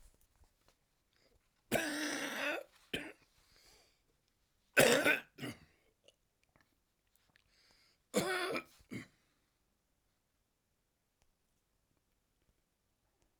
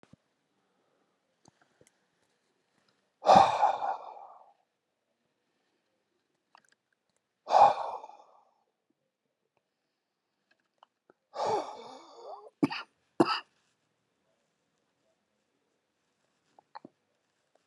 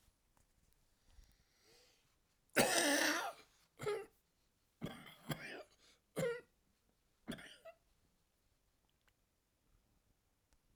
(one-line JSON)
{"three_cough_length": "13.4 s", "three_cough_amplitude": 8604, "three_cough_signal_mean_std_ratio": 0.28, "exhalation_length": "17.7 s", "exhalation_amplitude": 15475, "exhalation_signal_mean_std_ratio": 0.22, "cough_length": "10.8 s", "cough_amplitude": 4888, "cough_signal_mean_std_ratio": 0.31, "survey_phase": "alpha (2021-03-01 to 2021-08-12)", "age": "65+", "gender": "Male", "wearing_mask": "No", "symptom_cough_any": true, "symptom_fatigue": true, "symptom_headache": true, "symptom_onset": "6 days", "smoker_status": "Never smoked", "respiratory_condition_asthma": true, "respiratory_condition_other": true, "recruitment_source": "Test and Trace", "submission_delay": "2 days", "covid_test_result": "Positive", "covid_test_method": "RT-qPCR", "covid_ct_value": 15.3, "covid_ct_gene": "N gene", "covid_ct_mean": 15.9, "covid_viral_load": "5900000 copies/ml", "covid_viral_load_category": "High viral load (>1M copies/ml)"}